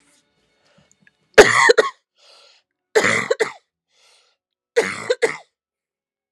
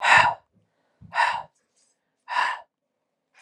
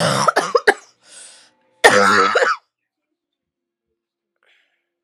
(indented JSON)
{
  "three_cough_length": "6.3 s",
  "three_cough_amplitude": 32768,
  "three_cough_signal_mean_std_ratio": 0.3,
  "exhalation_length": "3.4 s",
  "exhalation_amplitude": 29613,
  "exhalation_signal_mean_std_ratio": 0.37,
  "cough_length": "5.0 s",
  "cough_amplitude": 32768,
  "cough_signal_mean_std_ratio": 0.39,
  "survey_phase": "alpha (2021-03-01 to 2021-08-12)",
  "age": "18-44",
  "gender": "Female",
  "wearing_mask": "No",
  "symptom_cough_any": true,
  "symptom_shortness_of_breath": true,
  "symptom_fatigue": true,
  "symptom_change_to_sense_of_smell_or_taste": true,
  "symptom_onset": "4 days",
  "smoker_status": "Never smoked",
  "respiratory_condition_asthma": false,
  "respiratory_condition_other": false,
  "recruitment_source": "Test and Trace",
  "submission_delay": "2 days",
  "covid_test_result": "Positive",
  "covid_test_method": "RT-qPCR",
  "covid_ct_value": 22.2,
  "covid_ct_gene": "ORF1ab gene",
  "covid_ct_mean": 22.4,
  "covid_viral_load": "44000 copies/ml",
  "covid_viral_load_category": "Low viral load (10K-1M copies/ml)"
}